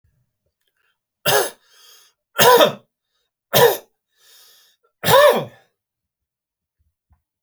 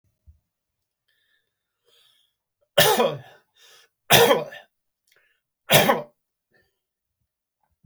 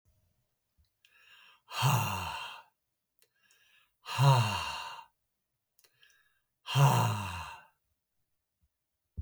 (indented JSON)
{
  "cough_length": "7.4 s",
  "cough_amplitude": 32768,
  "cough_signal_mean_std_ratio": 0.31,
  "three_cough_length": "7.9 s",
  "three_cough_amplitude": 32767,
  "three_cough_signal_mean_std_ratio": 0.28,
  "exhalation_length": "9.2 s",
  "exhalation_amplitude": 7975,
  "exhalation_signal_mean_std_ratio": 0.37,
  "survey_phase": "alpha (2021-03-01 to 2021-08-12)",
  "age": "45-64",
  "gender": "Male",
  "wearing_mask": "No",
  "symptom_none": true,
  "smoker_status": "Never smoked",
  "respiratory_condition_asthma": false,
  "respiratory_condition_other": false,
  "recruitment_source": "REACT",
  "submission_delay": "4 days",
  "covid_test_result": "Negative",
  "covid_test_method": "RT-qPCR"
}